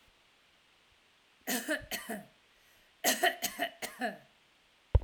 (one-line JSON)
{"cough_length": "5.0 s", "cough_amplitude": 8195, "cough_signal_mean_std_ratio": 0.36, "survey_phase": "alpha (2021-03-01 to 2021-08-12)", "age": "45-64", "gender": "Female", "wearing_mask": "No", "symptom_none": true, "smoker_status": "Never smoked", "respiratory_condition_asthma": false, "respiratory_condition_other": false, "recruitment_source": "REACT", "submission_delay": "1 day", "covid_test_result": "Negative", "covid_test_method": "RT-qPCR"}